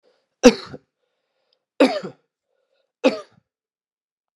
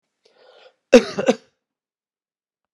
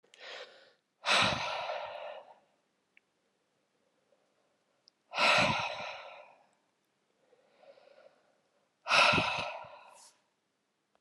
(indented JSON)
{
  "three_cough_length": "4.4 s",
  "three_cough_amplitude": 32768,
  "three_cough_signal_mean_std_ratio": 0.21,
  "cough_length": "2.7 s",
  "cough_amplitude": 32768,
  "cough_signal_mean_std_ratio": 0.2,
  "exhalation_length": "11.0 s",
  "exhalation_amplitude": 9362,
  "exhalation_signal_mean_std_ratio": 0.36,
  "survey_phase": "alpha (2021-03-01 to 2021-08-12)",
  "age": "45-64",
  "gender": "Male",
  "wearing_mask": "No",
  "symptom_none": true,
  "smoker_status": "Never smoked",
  "respiratory_condition_asthma": false,
  "respiratory_condition_other": false,
  "recruitment_source": "REACT",
  "submission_delay": "5 days",
  "covid_test_result": "Negative",
  "covid_test_method": "RT-qPCR"
}